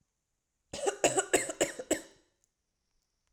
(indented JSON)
{
  "cough_length": "3.3 s",
  "cough_amplitude": 9421,
  "cough_signal_mean_std_ratio": 0.35,
  "survey_phase": "alpha (2021-03-01 to 2021-08-12)",
  "age": "18-44",
  "gender": "Female",
  "wearing_mask": "No",
  "symptom_none": true,
  "smoker_status": "Ex-smoker",
  "respiratory_condition_asthma": false,
  "respiratory_condition_other": false,
  "recruitment_source": "REACT",
  "submission_delay": "1 day",
  "covid_test_result": "Negative",
  "covid_test_method": "RT-qPCR"
}